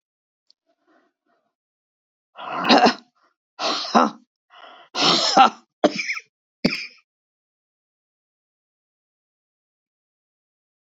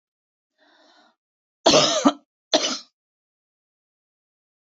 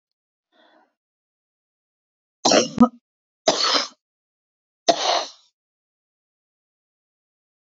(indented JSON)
{
  "exhalation_length": "10.9 s",
  "exhalation_amplitude": 28059,
  "exhalation_signal_mean_std_ratio": 0.29,
  "cough_length": "4.8 s",
  "cough_amplitude": 26414,
  "cough_signal_mean_std_ratio": 0.27,
  "three_cough_length": "7.7 s",
  "three_cough_amplitude": 26139,
  "three_cough_signal_mean_std_ratio": 0.26,
  "survey_phase": "beta (2021-08-13 to 2022-03-07)",
  "age": "65+",
  "gender": "Female",
  "wearing_mask": "No",
  "symptom_cough_any": true,
  "symptom_runny_or_blocked_nose": true,
  "smoker_status": "Ex-smoker",
  "respiratory_condition_asthma": false,
  "respiratory_condition_other": false,
  "recruitment_source": "Test and Trace",
  "submission_delay": "2 days",
  "covid_test_result": "Positive",
  "covid_test_method": "RT-qPCR",
  "covid_ct_value": 22.9,
  "covid_ct_gene": "N gene"
}